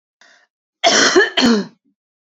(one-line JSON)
{"cough_length": "2.3 s", "cough_amplitude": 31523, "cough_signal_mean_std_ratio": 0.48, "survey_phase": "beta (2021-08-13 to 2022-03-07)", "age": "18-44", "gender": "Female", "wearing_mask": "No", "symptom_cough_any": true, "symptom_runny_or_blocked_nose": true, "symptom_headache": true, "symptom_change_to_sense_of_smell_or_taste": true, "symptom_loss_of_taste": true, "symptom_onset": "6 days", "smoker_status": "Never smoked", "respiratory_condition_asthma": false, "respiratory_condition_other": false, "recruitment_source": "Test and Trace", "submission_delay": "2 days", "covid_test_result": "Positive", "covid_test_method": "RT-qPCR", "covid_ct_value": 16.7, "covid_ct_gene": "ORF1ab gene", "covid_ct_mean": 17.2, "covid_viral_load": "2400000 copies/ml", "covid_viral_load_category": "High viral load (>1M copies/ml)"}